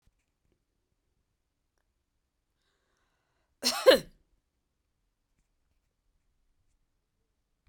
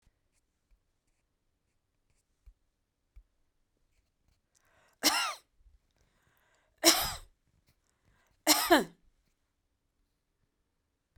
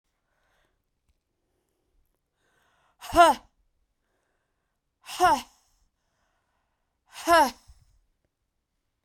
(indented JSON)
{
  "cough_length": "7.7 s",
  "cough_amplitude": 13954,
  "cough_signal_mean_std_ratio": 0.13,
  "three_cough_length": "11.2 s",
  "three_cough_amplitude": 18196,
  "three_cough_signal_mean_std_ratio": 0.21,
  "exhalation_length": "9.0 s",
  "exhalation_amplitude": 17301,
  "exhalation_signal_mean_std_ratio": 0.22,
  "survey_phase": "beta (2021-08-13 to 2022-03-07)",
  "age": "45-64",
  "gender": "Female",
  "wearing_mask": "No",
  "symptom_cough_any": true,
  "symptom_abdominal_pain": true,
  "symptom_diarrhoea": true,
  "symptom_fatigue": true,
  "symptom_headache": true,
  "symptom_onset": "7 days",
  "smoker_status": "Never smoked",
  "respiratory_condition_asthma": true,
  "respiratory_condition_other": false,
  "recruitment_source": "REACT",
  "submission_delay": "2 days",
  "covid_test_result": "Negative",
  "covid_test_method": "RT-qPCR"
}